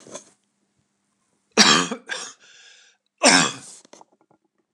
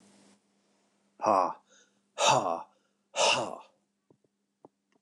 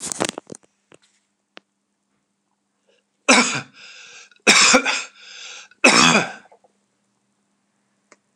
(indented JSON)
{
  "cough_length": "4.7 s",
  "cough_amplitude": 29204,
  "cough_signal_mean_std_ratio": 0.3,
  "exhalation_length": "5.0 s",
  "exhalation_amplitude": 9605,
  "exhalation_signal_mean_std_ratio": 0.35,
  "three_cough_length": "8.4 s",
  "three_cough_amplitude": 29204,
  "three_cough_signal_mean_std_ratio": 0.32,
  "survey_phase": "alpha (2021-03-01 to 2021-08-12)",
  "age": "45-64",
  "gender": "Male",
  "wearing_mask": "No",
  "symptom_none": true,
  "smoker_status": "Ex-smoker",
  "respiratory_condition_asthma": false,
  "respiratory_condition_other": false,
  "recruitment_source": "REACT",
  "submission_delay": "1 day",
  "covid_test_result": "Negative",
  "covid_test_method": "RT-qPCR"
}